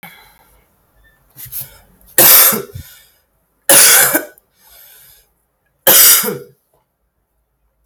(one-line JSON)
{"three_cough_length": "7.9 s", "three_cough_amplitude": 32768, "three_cough_signal_mean_std_ratio": 0.37, "survey_phase": "alpha (2021-03-01 to 2021-08-12)", "age": "18-44", "gender": "Female", "wearing_mask": "No", "symptom_cough_any": true, "symptom_fatigue": true, "symptom_headache": true, "symptom_onset": "12 days", "smoker_status": "Current smoker (1 to 10 cigarettes per day)", "respiratory_condition_asthma": false, "respiratory_condition_other": false, "recruitment_source": "REACT", "submission_delay": "2 days", "covid_test_result": "Negative", "covid_test_method": "RT-qPCR"}